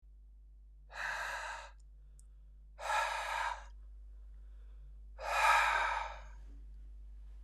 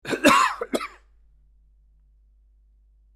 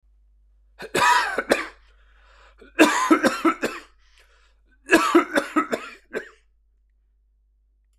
exhalation_length: 7.4 s
exhalation_amplitude: 5031
exhalation_signal_mean_std_ratio: 0.58
cough_length: 3.2 s
cough_amplitude: 24554
cough_signal_mean_std_ratio: 0.33
three_cough_length: 8.0 s
three_cough_amplitude: 25756
three_cough_signal_mean_std_ratio: 0.4
survey_phase: beta (2021-08-13 to 2022-03-07)
age: 45-64
gender: Male
wearing_mask: 'No'
symptom_cough_any: true
symptom_onset: 12 days
smoker_status: Never smoked
respiratory_condition_asthma: false
respiratory_condition_other: false
recruitment_source: REACT
submission_delay: 2 days
covid_test_result: Negative
covid_test_method: RT-qPCR
influenza_a_test_result: Unknown/Void
influenza_b_test_result: Unknown/Void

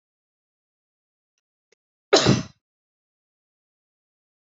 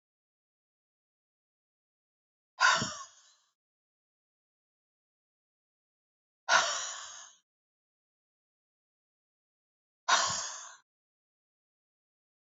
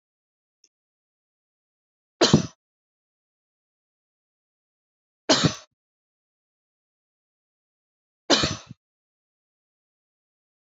cough_length: 4.5 s
cough_amplitude: 25742
cough_signal_mean_std_ratio: 0.18
exhalation_length: 12.5 s
exhalation_amplitude: 9897
exhalation_signal_mean_std_ratio: 0.23
three_cough_length: 10.7 s
three_cough_amplitude: 22756
three_cough_signal_mean_std_ratio: 0.18
survey_phase: beta (2021-08-13 to 2022-03-07)
age: 45-64
gender: Female
wearing_mask: 'No'
symptom_none: true
smoker_status: Never smoked
respiratory_condition_asthma: false
respiratory_condition_other: false
recruitment_source: REACT
submission_delay: 1 day
covid_test_result: Negative
covid_test_method: RT-qPCR
influenza_a_test_result: Negative
influenza_b_test_result: Negative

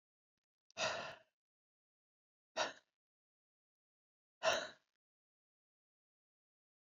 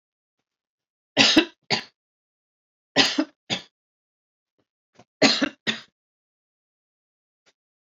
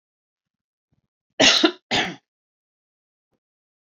exhalation_length: 6.9 s
exhalation_amplitude: 2662
exhalation_signal_mean_std_ratio: 0.24
three_cough_length: 7.9 s
three_cough_amplitude: 28166
three_cough_signal_mean_std_ratio: 0.26
cough_length: 3.8 s
cough_amplitude: 28252
cough_signal_mean_std_ratio: 0.26
survey_phase: alpha (2021-03-01 to 2021-08-12)
age: 45-64
gender: Female
wearing_mask: 'No'
symptom_cough_any: true
symptom_fatigue: true
symptom_headache: true
smoker_status: Ex-smoker
respiratory_condition_asthma: false
respiratory_condition_other: false
recruitment_source: Test and Trace
submission_delay: 2 days
covid_test_result: Positive
covid_test_method: RT-qPCR
covid_ct_value: 30.9
covid_ct_gene: ORF1ab gene
covid_ct_mean: 31.8
covid_viral_load: 36 copies/ml
covid_viral_load_category: Minimal viral load (< 10K copies/ml)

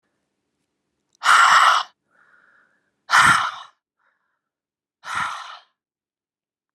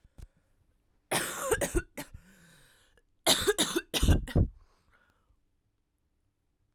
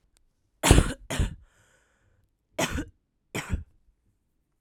exhalation_length: 6.7 s
exhalation_amplitude: 26873
exhalation_signal_mean_std_ratio: 0.34
cough_length: 6.7 s
cough_amplitude: 10196
cough_signal_mean_std_ratio: 0.37
three_cough_length: 4.6 s
three_cough_amplitude: 25021
three_cough_signal_mean_std_ratio: 0.29
survey_phase: alpha (2021-03-01 to 2021-08-12)
age: 18-44
gender: Female
wearing_mask: 'No'
symptom_fatigue: true
symptom_headache: true
symptom_change_to_sense_of_smell_or_taste: true
symptom_loss_of_taste: true
symptom_onset: 3 days
smoker_status: Never smoked
respiratory_condition_asthma: false
respiratory_condition_other: false
recruitment_source: Test and Trace
submission_delay: 1 day
covid_test_result: Positive
covid_test_method: RT-qPCR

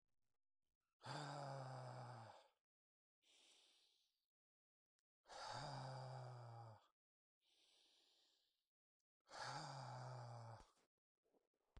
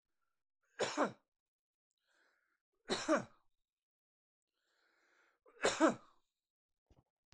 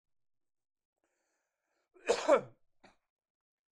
exhalation_length: 11.8 s
exhalation_amplitude: 438
exhalation_signal_mean_std_ratio: 0.55
three_cough_length: 7.3 s
three_cough_amplitude: 4188
three_cough_signal_mean_std_ratio: 0.25
cough_length: 3.7 s
cough_amplitude: 6426
cough_signal_mean_std_ratio: 0.21
survey_phase: beta (2021-08-13 to 2022-03-07)
age: 45-64
gender: Male
wearing_mask: 'No'
symptom_none: true
smoker_status: Ex-smoker
respiratory_condition_asthma: false
respiratory_condition_other: false
recruitment_source: REACT
submission_delay: 4 days
covid_test_result: Negative
covid_test_method: RT-qPCR
influenza_a_test_result: Negative
influenza_b_test_result: Negative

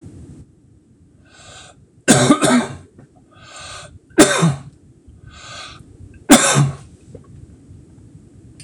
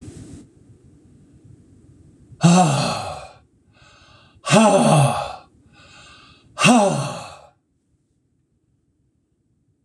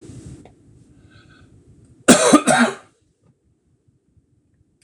three_cough_length: 8.6 s
three_cough_amplitude: 26028
three_cough_signal_mean_std_ratio: 0.36
exhalation_length: 9.8 s
exhalation_amplitude: 26027
exhalation_signal_mean_std_ratio: 0.38
cough_length: 4.8 s
cough_amplitude: 26028
cough_signal_mean_std_ratio: 0.28
survey_phase: beta (2021-08-13 to 2022-03-07)
age: 65+
gender: Male
wearing_mask: 'No'
symptom_none: true
smoker_status: Ex-smoker
respiratory_condition_asthma: true
respiratory_condition_other: false
recruitment_source: REACT
submission_delay: 1 day
covid_test_result: Negative
covid_test_method: RT-qPCR
influenza_a_test_result: Negative
influenza_b_test_result: Negative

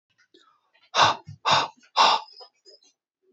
exhalation_length: 3.3 s
exhalation_amplitude: 18613
exhalation_signal_mean_std_ratio: 0.36
survey_phase: beta (2021-08-13 to 2022-03-07)
age: 18-44
gender: Male
wearing_mask: 'No'
symptom_fatigue: true
smoker_status: Never smoked
respiratory_condition_asthma: false
respiratory_condition_other: false
recruitment_source: REACT
submission_delay: 1 day
covid_test_result: Negative
covid_test_method: RT-qPCR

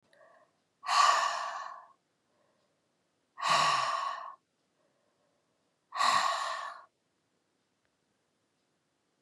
exhalation_length: 9.2 s
exhalation_amplitude: 7891
exhalation_signal_mean_std_ratio: 0.4
survey_phase: beta (2021-08-13 to 2022-03-07)
age: 45-64
gender: Female
wearing_mask: 'No'
symptom_cough_any: true
symptom_new_continuous_cough: true
symptom_runny_or_blocked_nose: true
symptom_sore_throat: true
symptom_fatigue: true
symptom_fever_high_temperature: true
symptom_change_to_sense_of_smell_or_taste: true
symptom_loss_of_taste: true
symptom_other: true
symptom_onset: 3 days
smoker_status: Never smoked
respiratory_condition_asthma: false
respiratory_condition_other: false
recruitment_source: Test and Trace
submission_delay: 1 day
covid_test_result: Positive
covid_test_method: LAMP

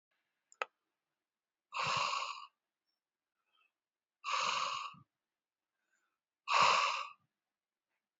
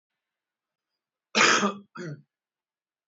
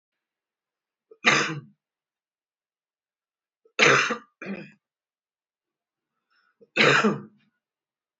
exhalation_length: 8.2 s
exhalation_amplitude: 5918
exhalation_signal_mean_std_ratio: 0.36
cough_length: 3.1 s
cough_amplitude: 17667
cough_signal_mean_std_ratio: 0.3
three_cough_length: 8.2 s
three_cough_amplitude: 21475
three_cough_signal_mean_std_ratio: 0.29
survey_phase: beta (2021-08-13 to 2022-03-07)
age: 18-44
gender: Male
wearing_mask: 'No'
symptom_change_to_sense_of_smell_or_taste: true
smoker_status: Ex-smoker
respiratory_condition_asthma: false
respiratory_condition_other: false
recruitment_source: REACT
submission_delay: 2 days
covid_test_result: Negative
covid_test_method: RT-qPCR
influenza_a_test_result: Negative
influenza_b_test_result: Negative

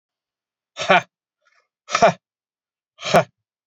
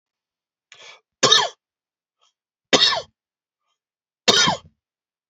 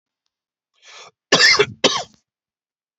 exhalation_length: 3.7 s
exhalation_amplitude: 29099
exhalation_signal_mean_std_ratio: 0.27
three_cough_length: 5.3 s
three_cough_amplitude: 32767
three_cough_signal_mean_std_ratio: 0.3
cough_length: 3.0 s
cough_amplitude: 32768
cough_signal_mean_std_ratio: 0.32
survey_phase: beta (2021-08-13 to 2022-03-07)
age: 18-44
gender: Male
wearing_mask: 'No'
symptom_none: true
smoker_status: Ex-smoker
respiratory_condition_asthma: false
respiratory_condition_other: false
recruitment_source: REACT
submission_delay: 3 days
covid_test_result: Negative
covid_test_method: RT-qPCR
influenza_a_test_result: Negative
influenza_b_test_result: Negative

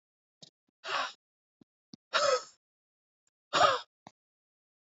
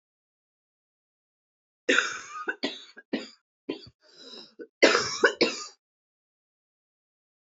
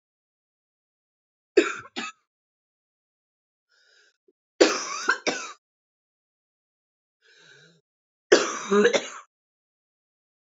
exhalation_length: 4.9 s
exhalation_amplitude: 9007
exhalation_signal_mean_std_ratio: 0.3
cough_length: 7.4 s
cough_amplitude: 20808
cough_signal_mean_std_ratio: 0.3
three_cough_length: 10.5 s
three_cough_amplitude: 26471
three_cough_signal_mean_std_ratio: 0.26
survey_phase: beta (2021-08-13 to 2022-03-07)
age: 45-64
gender: Female
wearing_mask: 'No'
symptom_cough_any: true
symptom_runny_or_blocked_nose: true
symptom_sore_throat: true
symptom_fatigue: true
symptom_headache: true
symptom_onset: 3 days
smoker_status: Current smoker (11 or more cigarettes per day)
respiratory_condition_asthma: false
respiratory_condition_other: false
recruitment_source: Test and Trace
submission_delay: 2 days
covid_test_result: Positive
covid_test_method: RT-qPCR
covid_ct_value: 32.4
covid_ct_gene: ORF1ab gene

